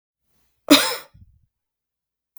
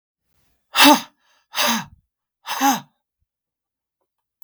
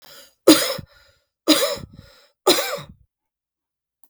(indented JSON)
{
  "cough_length": "2.4 s",
  "cough_amplitude": 32768,
  "cough_signal_mean_std_ratio": 0.22,
  "exhalation_length": "4.4 s",
  "exhalation_amplitude": 32768,
  "exhalation_signal_mean_std_ratio": 0.3,
  "three_cough_length": "4.1 s",
  "three_cough_amplitude": 32768,
  "three_cough_signal_mean_std_ratio": 0.32,
  "survey_phase": "beta (2021-08-13 to 2022-03-07)",
  "age": "45-64",
  "gender": "Female",
  "wearing_mask": "No",
  "symptom_cough_any": true,
  "symptom_runny_or_blocked_nose": true,
  "symptom_shortness_of_breath": true,
  "symptom_fatigue": true,
  "symptom_change_to_sense_of_smell_or_taste": true,
  "symptom_loss_of_taste": true,
  "symptom_onset": "4 days",
  "smoker_status": "Never smoked",
  "respiratory_condition_asthma": true,
  "respiratory_condition_other": false,
  "recruitment_source": "Test and Trace",
  "submission_delay": "2 days",
  "covid_test_result": "Positive",
  "covid_test_method": "ePCR"
}